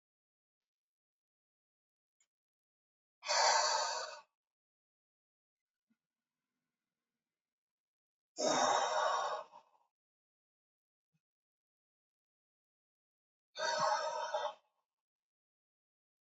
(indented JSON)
{
  "exhalation_length": "16.2 s",
  "exhalation_amplitude": 4385,
  "exhalation_signal_mean_std_ratio": 0.33,
  "survey_phase": "alpha (2021-03-01 to 2021-08-12)",
  "age": "45-64",
  "gender": "Male",
  "wearing_mask": "No",
  "symptom_none": true,
  "smoker_status": "Ex-smoker",
  "respiratory_condition_asthma": false,
  "respiratory_condition_other": false,
  "recruitment_source": "REACT",
  "submission_delay": "1 day",
  "covid_test_result": "Negative",
  "covid_test_method": "RT-qPCR"
}